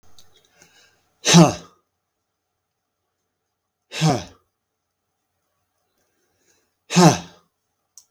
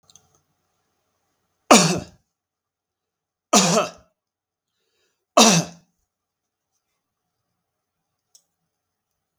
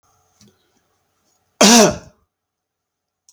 {"exhalation_length": "8.1 s", "exhalation_amplitude": 32768, "exhalation_signal_mean_std_ratio": 0.23, "three_cough_length": "9.4 s", "three_cough_amplitude": 32768, "three_cough_signal_mean_std_ratio": 0.23, "cough_length": "3.3 s", "cough_amplitude": 32768, "cough_signal_mean_std_ratio": 0.26, "survey_phase": "beta (2021-08-13 to 2022-03-07)", "age": "45-64", "gender": "Male", "wearing_mask": "No", "symptom_none": true, "smoker_status": "Never smoked", "respiratory_condition_asthma": false, "respiratory_condition_other": false, "recruitment_source": "REACT", "submission_delay": "1 day", "covid_test_result": "Negative", "covid_test_method": "RT-qPCR", "influenza_a_test_result": "Negative", "influenza_b_test_result": "Negative"}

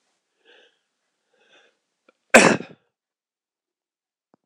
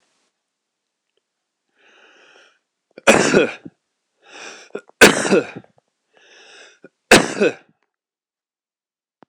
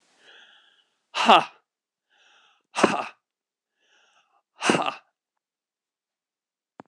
{"cough_length": "4.5 s", "cough_amplitude": 26028, "cough_signal_mean_std_ratio": 0.17, "three_cough_length": "9.3 s", "three_cough_amplitude": 26028, "three_cough_signal_mean_std_ratio": 0.26, "exhalation_length": "6.9 s", "exhalation_amplitude": 26028, "exhalation_signal_mean_std_ratio": 0.23, "survey_phase": "beta (2021-08-13 to 2022-03-07)", "age": "45-64", "gender": "Male", "wearing_mask": "No", "symptom_cough_any": true, "symptom_new_continuous_cough": true, "symptom_runny_or_blocked_nose": true, "symptom_sore_throat": true, "symptom_fatigue": true, "symptom_onset": "2 days", "smoker_status": "Never smoked", "respiratory_condition_asthma": false, "respiratory_condition_other": true, "recruitment_source": "Test and Trace", "submission_delay": "1 day", "covid_test_result": "Positive", "covid_test_method": "RT-qPCR", "covid_ct_value": 23.6, "covid_ct_gene": "N gene", "covid_ct_mean": 23.8, "covid_viral_load": "16000 copies/ml", "covid_viral_load_category": "Low viral load (10K-1M copies/ml)"}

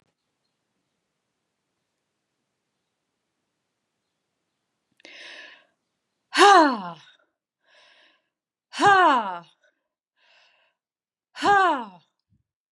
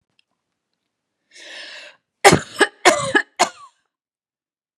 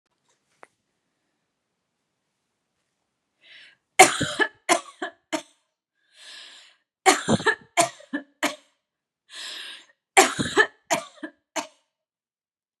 {"exhalation_length": "12.7 s", "exhalation_amplitude": 25634, "exhalation_signal_mean_std_ratio": 0.26, "cough_length": "4.8 s", "cough_amplitude": 32768, "cough_signal_mean_std_ratio": 0.27, "three_cough_length": "12.8 s", "three_cough_amplitude": 32768, "three_cough_signal_mean_std_ratio": 0.26, "survey_phase": "beta (2021-08-13 to 2022-03-07)", "age": "18-44", "gender": "Female", "wearing_mask": "No", "symptom_cough_any": true, "smoker_status": "Current smoker (1 to 10 cigarettes per day)", "respiratory_condition_asthma": false, "respiratory_condition_other": false, "recruitment_source": "REACT", "submission_delay": "2 days", "covid_test_result": "Negative", "covid_test_method": "RT-qPCR", "influenza_a_test_result": "Negative", "influenza_b_test_result": "Negative"}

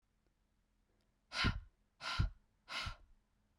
{"exhalation_length": "3.6 s", "exhalation_amplitude": 2347, "exhalation_signal_mean_std_ratio": 0.36, "survey_phase": "beta (2021-08-13 to 2022-03-07)", "age": "18-44", "gender": "Female", "wearing_mask": "No", "symptom_cough_any": true, "symptom_runny_or_blocked_nose": true, "symptom_sore_throat": true, "symptom_fatigue": true, "symptom_fever_high_temperature": true, "symptom_headache": true, "symptom_other": true, "symptom_onset": "3 days", "smoker_status": "Never smoked", "respiratory_condition_asthma": true, "respiratory_condition_other": false, "recruitment_source": "Test and Trace", "submission_delay": "1 day", "covid_test_result": "Positive", "covid_test_method": "RT-qPCR", "covid_ct_value": 17.8, "covid_ct_gene": "N gene", "covid_ct_mean": 18.6, "covid_viral_load": "810000 copies/ml", "covid_viral_load_category": "Low viral load (10K-1M copies/ml)"}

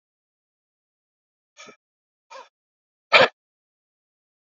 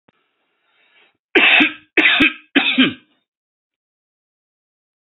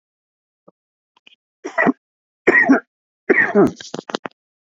{"exhalation_length": "4.4 s", "exhalation_amplitude": 28628, "exhalation_signal_mean_std_ratio": 0.15, "cough_length": "5.0 s", "cough_amplitude": 30382, "cough_signal_mean_std_ratio": 0.37, "three_cough_length": "4.6 s", "three_cough_amplitude": 29691, "three_cough_signal_mean_std_ratio": 0.36, "survey_phase": "alpha (2021-03-01 to 2021-08-12)", "age": "45-64", "gender": "Male", "wearing_mask": "No", "symptom_fatigue": true, "smoker_status": "Current smoker (e-cigarettes or vapes only)", "respiratory_condition_asthma": false, "respiratory_condition_other": true, "recruitment_source": "REACT", "submission_delay": "1 day", "covid_test_result": "Negative", "covid_test_method": "RT-qPCR"}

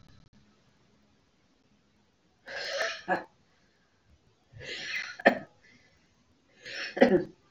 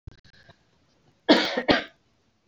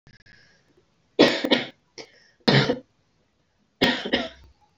{"exhalation_length": "7.5 s", "exhalation_amplitude": 22380, "exhalation_signal_mean_std_ratio": 0.29, "cough_length": "2.5 s", "cough_amplitude": 26352, "cough_signal_mean_std_ratio": 0.31, "three_cough_length": "4.8 s", "three_cough_amplitude": 27295, "three_cough_signal_mean_std_ratio": 0.35, "survey_phase": "alpha (2021-03-01 to 2021-08-12)", "age": "18-44", "gender": "Female", "wearing_mask": "No", "symptom_none": true, "smoker_status": "Never smoked", "respiratory_condition_asthma": true, "respiratory_condition_other": false, "recruitment_source": "REACT", "submission_delay": "1 day", "covid_test_result": "Negative", "covid_test_method": "RT-qPCR"}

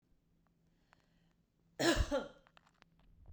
{"cough_length": "3.3 s", "cough_amplitude": 3982, "cough_signal_mean_std_ratio": 0.3, "survey_phase": "beta (2021-08-13 to 2022-03-07)", "age": "18-44", "gender": "Female", "wearing_mask": "No", "symptom_none": true, "smoker_status": "Never smoked", "respiratory_condition_asthma": true, "respiratory_condition_other": false, "recruitment_source": "REACT", "submission_delay": "1 day", "covid_test_result": "Negative", "covid_test_method": "RT-qPCR"}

